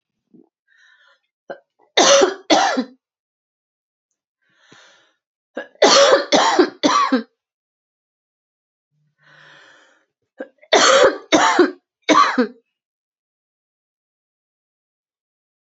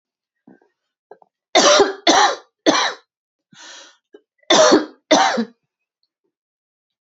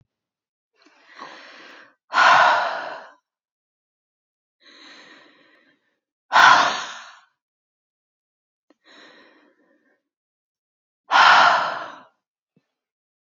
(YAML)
three_cough_length: 15.6 s
three_cough_amplitude: 32768
three_cough_signal_mean_std_ratio: 0.36
cough_length: 7.1 s
cough_amplitude: 32134
cough_signal_mean_std_ratio: 0.39
exhalation_length: 13.3 s
exhalation_amplitude: 30061
exhalation_signal_mean_std_ratio: 0.3
survey_phase: beta (2021-08-13 to 2022-03-07)
age: 45-64
gender: Female
wearing_mask: 'No'
symptom_cough_any: true
symptom_onset: 4 days
smoker_status: Ex-smoker
respiratory_condition_asthma: false
respiratory_condition_other: false
recruitment_source: REACT
submission_delay: 2 days
covid_test_result: Negative
covid_test_method: RT-qPCR
influenza_a_test_result: Negative
influenza_b_test_result: Negative